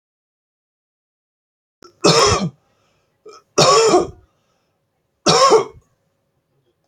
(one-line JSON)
{"three_cough_length": "6.9 s", "three_cough_amplitude": 32768, "three_cough_signal_mean_std_ratio": 0.36, "survey_phase": "beta (2021-08-13 to 2022-03-07)", "age": "45-64", "gender": "Male", "wearing_mask": "No", "symptom_none": true, "symptom_onset": "13 days", "smoker_status": "Never smoked", "respiratory_condition_asthma": false, "respiratory_condition_other": false, "recruitment_source": "REACT", "submission_delay": "2 days", "covid_test_result": "Negative", "covid_test_method": "RT-qPCR", "influenza_a_test_result": "Negative", "influenza_b_test_result": "Negative"}